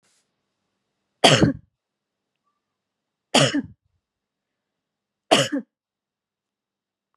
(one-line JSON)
{"three_cough_length": "7.2 s", "three_cough_amplitude": 32767, "three_cough_signal_mean_std_ratio": 0.24, "survey_phase": "beta (2021-08-13 to 2022-03-07)", "age": "18-44", "gender": "Female", "wearing_mask": "No", "symptom_none": true, "smoker_status": "Never smoked", "respiratory_condition_asthma": false, "respiratory_condition_other": false, "recruitment_source": "REACT", "submission_delay": "1 day", "covid_test_result": "Negative", "covid_test_method": "RT-qPCR"}